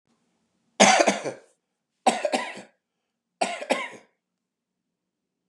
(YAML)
three_cough_length: 5.5 s
three_cough_amplitude: 30747
three_cough_signal_mean_std_ratio: 0.31
survey_phase: beta (2021-08-13 to 2022-03-07)
age: 45-64
gender: Male
wearing_mask: 'No'
symptom_none: true
symptom_onset: 13 days
smoker_status: Ex-smoker
respiratory_condition_asthma: false
respiratory_condition_other: false
recruitment_source: REACT
submission_delay: 3 days
covid_test_result: Negative
covid_test_method: RT-qPCR
influenza_a_test_result: Negative
influenza_b_test_result: Negative